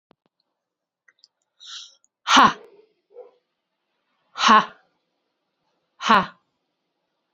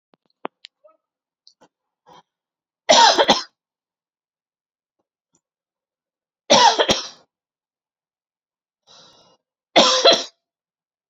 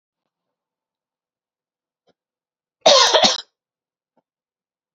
{"exhalation_length": "7.3 s", "exhalation_amplitude": 29248, "exhalation_signal_mean_std_ratio": 0.24, "three_cough_length": "11.1 s", "three_cough_amplitude": 32425, "three_cough_signal_mean_std_ratio": 0.27, "cough_length": "4.9 s", "cough_amplitude": 30521, "cough_signal_mean_std_ratio": 0.25, "survey_phase": "beta (2021-08-13 to 2022-03-07)", "age": "45-64", "gender": "Female", "wearing_mask": "No", "symptom_headache": true, "symptom_onset": "6 days", "smoker_status": "Never smoked", "respiratory_condition_asthma": false, "respiratory_condition_other": false, "recruitment_source": "REACT", "submission_delay": "2 days", "covid_test_result": "Negative", "covid_test_method": "RT-qPCR", "influenza_a_test_result": "Negative", "influenza_b_test_result": "Negative"}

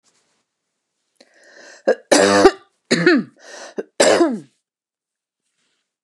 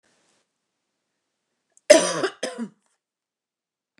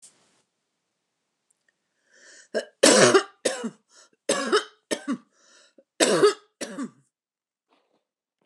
{"exhalation_length": "6.0 s", "exhalation_amplitude": 29204, "exhalation_signal_mean_std_ratio": 0.36, "cough_length": "4.0 s", "cough_amplitude": 29204, "cough_signal_mean_std_ratio": 0.21, "three_cough_length": "8.5 s", "three_cough_amplitude": 23869, "three_cough_signal_mean_std_ratio": 0.31, "survey_phase": "beta (2021-08-13 to 2022-03-07)", "age": "65+", "gender": "Female", "wearing_mask": "No", "symptom_none": true, "smoker_status": "Ex-smoker", "respiratory_condition_asthma": false, "respiratory_condition_other": false, "recruitment_source": "Test and Trace", "submission_delay": "1 day", "covid_test_result": "Negative", "covid_test_method": "RT-qPCR"}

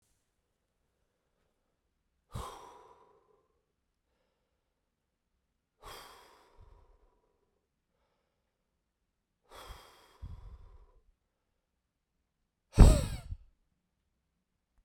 {"exhalation_length": "14.8 s", "exhalation_amplitude": 20360, "exhalation_signal_mean_std_ratio": 0.13, "survey_phase": "beta (2021-08-13 to 2022-03-07)", "age": "18-44", "gender": "Male", "wearing_mask": "No", "symptom_cough_any": true, "symptom_runny_or_blocked_nose": true, "symptom_fatigue": true, "symptom_change_to_sense_of_smell_or_taste": true, "symptom_onset": "5 days", "smoker_status": "Never smoked", "respiratory_condition_asthma": false, "respiratory_condition_other": false, "recruitment_source": "Test and Trace", "submission_delay": "2 days", "covid_test_result": "Positive", "covid_test_method": "LAMP"}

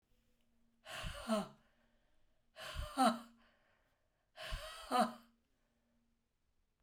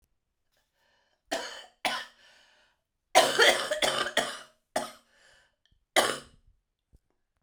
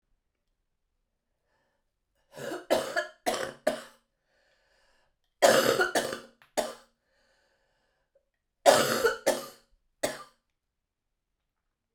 {"exhalation_length": "6.8 s", "exhalation_amplitude": 3231, "exhalation_signal_mean_std_ratio": 0.33, "cough_length": "7.4 s", "cough_amplitude": 17480, "cough_signal_mean_std_ratio": 0.34, "three_cough_length": "11.9 s", "three_cough_amplitude": 21610, "three_cough_signal_mean_std_ratio": 0.31, "survey_phase": "beta (2021-08-13 to 2022-03-07)", "age": "45-64", "gender": "Female", "wearing_mask": "No", "symptom_cough_any": true, "symptom_runny_or_blocked_nose": true, "symptom_diarrhoea": true, "symptom_fatigue": true, "symptom_headache": true, "symptom_change_to_sense_of_smell_or_taste": true, "symptom_onset": "3 days", "smoker_status": "Never smoked", "respiratory_condition_asthma": false, "respiratory_condition_other": false, "recruitment_source": "Test and Trace", "submission_delay": "2 days", "covid_test_result": "Positive", "covid_test_method": "RT-qPCR", "covid_ct_value": 15.0, "covid_ct_gene": "ORF1ab gene", "covid_ct_mean": 15.2, "covid_viral_load": "10000000 copies/ml", "covid_viral_load_category": "High viral load (>1M copies/ml)"}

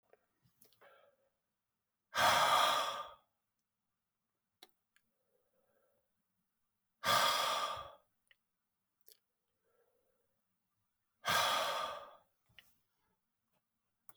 {"exhalation_length": "14.2 s", "exhalation_amplitude": 4562, "exhalation_signal_mean_std_ratio": 0.33, "survey_phase": "beta (2021-08-13 to 2022-03-07)", "age": "65+", "gender": "Male", "wearing_mask": "No", "symptom_cough_any": true, "symptom_runny_or_blocked_nose": true, "symptom_fever_high_temperature": true, "symptom_headache": true, "symptom_onset": "3 days", "smoker_status": "Never smoked", "respiratory_condition_asthma": false, "respiratory_condition_other": false, "recruitment_source": "Test and Trace", "submission_delay": "2 days", "covid_test_result": "Positive", "covid_test_method": "RT-qPCR"}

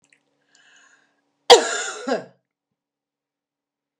{"exhalation_length": "4.0 s", "exhalation_amplitude": 32768, "exhalation_signal_mean_std_ratio": 0.21, "survey_phase": "beta (2021-08-13 to 2022-03-07)", "age": "65+", "gender": "Female", "wearing_mask": "No", "symptom_none": true, "smoker_status": "Never smoked", "respiratory_condition_asthma": false, "respiratory_condition_other": false, "recruitment_source": "REACT", "submission_delay": "1 day", "covid_test_result": "Negative", "covid_test_method": "RT-qPCR", "influenza_a_test_result": "Negative", "influenza_b_test_result": "Negative"}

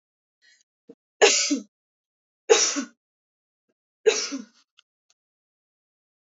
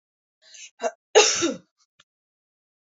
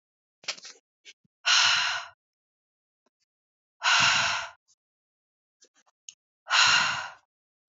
{"three_cough_length": "6.2 s", "three_cough_amplitude": 24148, "three_cough_signal_mean_std_ratio": 0.28, "cough_length": "3.0 s", "cough_amplitude": 26083, "cough_signal_mean_std_ratio": 0.28, "exhalation_length": "7.7 s", "exhalation_amplitude": 13725, "exhalation_signal_mean_std_ratio": 0.39, "survey_phase": "beta (2021-08-13 to 2022-03-07)", "age": "18-44", "gender": "Female", "wearing_mask": "No", "symptom_sore_throat": true, "symptom_fatigue": true, "symptom_headache": true, "smoker_status": "Never smoked", "respiratory_condition_asthma": false, "respiratory_condition_other": false, "recruitment_source": "Test and Trace", "submission_delay": "2 days", "covid_test_result": "Positive", "covid_test_method": "RT-qPCR", "covid_ct_value": 16.4, "covid_ct_gene": "ORF1ab gene", "covid_ct_mean": 16.6, "covid_viral_load": "3500000 copies/ml", "covid_viral_load_category": "High viral load (>1M copies/ml)"}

